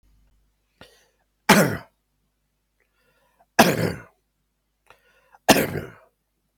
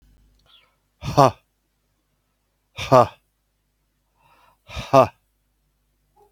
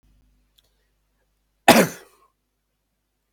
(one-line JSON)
{"three_cough_length": "6.6 s", "three_cough_amplitude": 32768, "three_cough_signal_mean_std_ratio": 0.26, "exhalation_length": "6.3 s", "exhalation_amplitude": 32766, "exhalation_signal_mean_std_ratio": 0.22, "cough_length": "3.3 s", "cough_amplitude": 32768, "cough_signal_mean_std_ratio": 0.18, "survey_phase": "beta (2021-08-13 to 2022-03-07)", "age": "65+", "gender": "Male", "wearing_mask": "No", "symptom_none": true, "symptom_onset": "13 days", "smoker_status": "Ex-smoker", "respiratory_condition_asthma": false, "respiratory_condition_other": false, "recruitment_source": "REACT", "submission_delay": "1 day", "covid_test_result": "Negative", "covid_test_method": "RT-qPCR", "influenza_a_test_result": "Negative", "influenza_b_test_result": "Negative"}